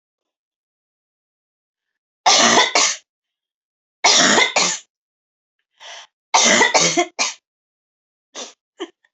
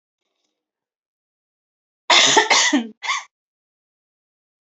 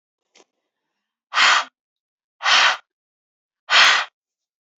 {"three_cough_length": "9.1 s", "three_cough_amplitude": 32767, "three_cough_signal_mean_std_ratio": 0.4, "cough_length": "4.6 s", "cough_amplitude": 29704, "cough_signal_mean_std_ratio": 0.34, "exhalation_length": "4.8 s", "exhalation_amplitude": 27078, "exhalation_signal_mean_std_ratio": 0.36, "survey_phase": "beta (2021-08-13 to 2022-03-07)", "age": "18-44", "gender": "Female", "wearing_mask": "No", "symptom_headache": true, "symptom_onset": "3 days", "smoker_status": "Never smoked", "respiratory_condition_asthma": false, "respiratory_condition_other": false, "recruitment_source": "Test and Trace", "submission_delay": "2 days", "covid_test_result": "Positive", "covid_test_method": "RT-qPCR", "covid_ct_value": 26.0, "covid_ct_gene": "ORF1ab gene", "covid_ct_mean": 26.1, "covid_viral_load": "2800 copies/ml", "covid_viral_load_category": "Minimal viral load (< 10K copies/ml)"}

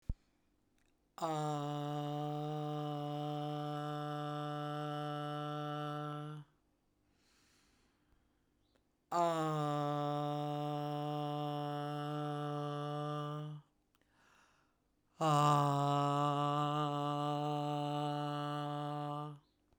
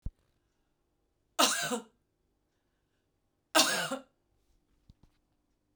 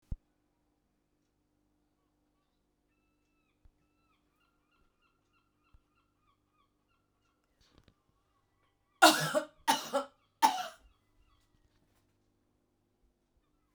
{"exhalation_length": "19.8 s", "exhalation_amplitude": 3756, "exhalation_signal_mean_std_ratio": 0.78, "cough_length": "5.8 s", "cough_amplitude": 13126, "cough_signal_mean_std_ratio": 0.28, "three_cough_length": "13.7 s", "three_cough_amplitude": 15104, "three_cough_signal_mean_std_ratio": 0.17, "survey_phase": "beta (2021-08-13 to 2022-03-07)", "age": "45-64", "gender": "Female", "wearing_mask": "No", "symptom_none": true, "smoker_status": "Ex-smoker", "respiratory_condition_asthma": false, "respiratory_condition_other": false, "recruitment_source": "REACT", "submission_delay": "1 day", "covid_test_result": "Negative", "covid_test_method": "RT-qPCR", "influenza_a_test_result": "Negative", "influenza_b_test_result": "Negative"}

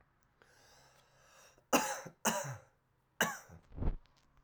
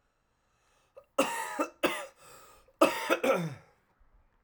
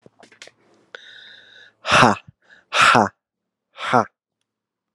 {"three_cough_length": "4.4 s", "three_cough_amplitude": 6358, "three_cough_signal_mean_std_ratio": 0.36, "cough_length": "4.4 s", "cough_amplitude": 13800, "cough_signal_mean_std_ratio": 0.39, "exhalation_length": "4.9 s", "exhalation_amplitude": 32767, "exhalation_signal_mean_std_ratio": 0.31, "survey_phase": "alpha (2021-03-01 to 2021-08-12)", "age": "18-44", "gender": "Male", "wearing_mask": "No", "symptom_cough_any": true, "symptom_fatigue": true, "symptom_fever_high_temperature": true, "symptom_headache": true, "smoker_status": "Never smoked", "respiratory_condition_asthma": false, "respiratory_condition_other": false, "recruitment_source": "Test and Trace", "submission_delay": "2 days", "covid_test_result": "Positive", "covid_test_method": "RT-qPCR"}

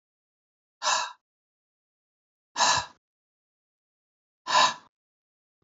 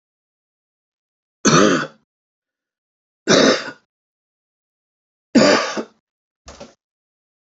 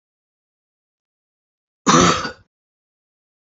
{"exhalation_length": "5.6 s", "exhalation_amplitude": 12645, "exhalation_signal_mean_std_ratio": 0.28, "three_cough_length": "7.6 s", "three_cough_amplitude": 31332, "three_cough_signal_mean_std_ratio": 0.31, "cough_length": "3.6 s", "cough_amplitude": 30291, "cough_signal_mean_std_ratio": 0.25, "survey_phase": "beta (2021-08-13 to 2022-03-07)", "age": "65+", "gender": "Male", "wearing_mask": "No", "symptom_none": true, "smoker_status": "Ex-smoker", "respiratory_condition_asthma": false, "respiratory_condition_other": false, "recruitment_source": "REACT", "submission_delay": "2 days", "covid_test_result": "Negative", "covid_test_method": "RT-qPCR", "influenza_a_test_result": "Negative", "influenza_b_test_result": "Negative"}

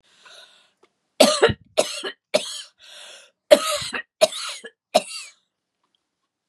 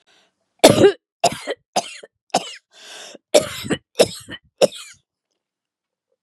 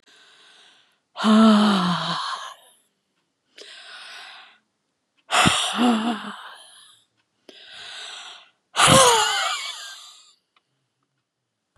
{"three_cough_length": "6.5 s", "three_cough_amplitude": 32768, "three_cough_signal_mean_std_ratio": 0.31, "cough_length": "6.2 s", "cough_amplitude": 32768, "cough_signal_mean_std_ratio": 0.3, "exhalation_length": "11.8 s", "exhalation_amplitude": 31800, "exhalation_signal_mean_std_ratio": 0.41, "survey_phase": "beta (2021-08-13 to 2022-03-07)", "age": "65+", "gender": "Female", "wearing_mask": "No", "symptom_none": true, "smoker_status": "Ex-smoker", "respiratory_condition_asthma": false, "respiratory_condition_other": false, "recruitment_source": "REACT", "submission_delay": "4 days", "covid_test_result": "Negative", "covid_test_method": "RT-qPCR", "influenza_a_test_result": "Negative", "influenza_b_test_result": "Negative"}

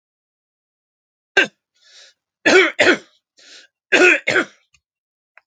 {"three_cough_length": "5.5 s", "three_cough_amplitude": 32767, "three_cough_signal_mean_std_ratio": 0.33, "survey_phase": "alpha (2021-03-01 to 2021-08-12)", "age": "65+", "gender": "Male", "wearing_mask": "No", "symptom_none": true, "smoker_status": "Never smoked", "respiratory_condition_asthma": true, "respiratory_condition_other": false, "recruitment_source": "REACT", "submission_delay": "3 days", "covid_test_result": "Negative", "covid_test_method": "RT-qPCR"}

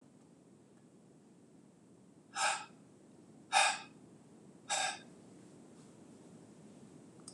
{"exhalation_length": "7.3 s", "exhalation_amplitude": 5895, "exhalation_signal_mean_std_ratio": 0.35, "survey_phase": "beta (2021-08-13 to 2022-03-07)", "age": "45-64", "gender": "Male", "wearing_mask": "No", "symptom_sore_throat": true, "smoker_status": "Never smoked", "respiratory_condition_asthma": false, "respiratory_condition_other": false, "recruitment_source": "REACT", "submission_delay": "8 days", "covid_test_result": "Negative", "covid_test_method": "RT-qPCR", "influenza_a_test_result": "Negative", "influenza_b_test_result": "Negative"}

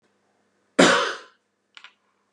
{"cough_length": "2.3 s", "cough_amplitude": 28953, "cough_signal_mean_std_ratio": 0.29, "survey_phase": "beta (2021-08-13 to 2022-03-07)", "age": "65+", "gender": "Male", "wearing_mask": "No", "symptom_none": true, "symptom_onset": "6 days", "smoker_status": "Ex-smoker", "respiratory_condition_asthma": false, "respiratory_condition_other": false, "recruitment_source": "REACT", "submission_delay": "6 days", "covid_test_result": "Negative", "covid_test_method": "RT-qPCR", "influenza_a_test_result": "Negative", "influenza_b_test_result": "Negative"}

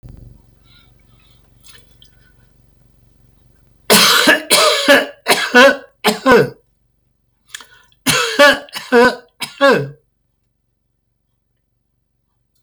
{"cough_length": "12.6 s", "cough_amplitude": 32768, "cough_signal_mean_std_ratio": 0.39, "survey_phase": "beta (2021-08-13 to 2022-03-07)", "age": "65+", "gender": "Male", "wearing_mask": "No", "symptom_none": true, "smoker_status": "Ex-smoker", "respiratory_condition_asthma": false, "respiratory_condition_other": false, "recruitment_source": "REACT", "submission_delay": "1 day", "covid_test_result": "Negative", "covid_test_method": "RT-qPCR", "influenza_a_test_result": "Negative", "influenza_b_test_result": "Negative"}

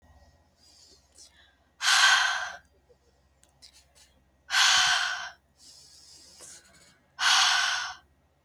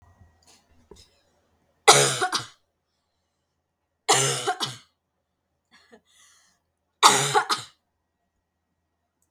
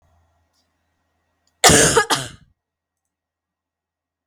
{"exhalation_length": "8.4 s", "exhalation_amplitude": 12924, "exhalation_signal_mean_std_ratio": 0.42, "three_cough_length": "9.3 s", "three_cough_amplitude": 32768, "three_cough_signal_mean_std_ratio": 0.28, "cough_length": "4.3 s", "cough_amplitude": 32768, "cough_signal_mean_std_ratio": 0.27, "survey_phase": "alpha (2021-03-01 to 2021-08-12)", "age": "18-44", "gender": "Female", "wearing_mask": "No", "symptom_none": true, "smoker_status": "Never smoked", "respiratory_condition_asthma": false, "respiratory_condition_other": false, "recruitment_source": "REACT", "submission_delay": "2 days", "covid_test_result": "Negative", "covid_test_method": "RT-qPCR"}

